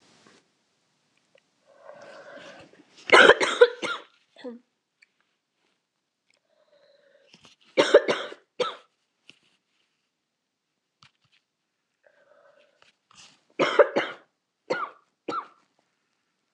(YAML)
three_cough_length: 16.5 s
three_cough_amplitude: 26027
three_cough_signal_mean_std_ratio: 0.22
survey_phase: beta (2021-08-13 to 2022-03-07)
age: 18-44
gender: Female
wearing_mask: 'No'
symptom_cough_any: true
symptom_runny_or_blocked_nose: true
symptom_sore_throat: true
symptom_headache: true
smoker_status: Never smoked
respiratory_condition_asthma: false
respiratory_condition_other: false
recruitment_source: Test and Trace
submission_delay: 2 days
covid_test_result: Positive
covid_test_method: RT-qPCR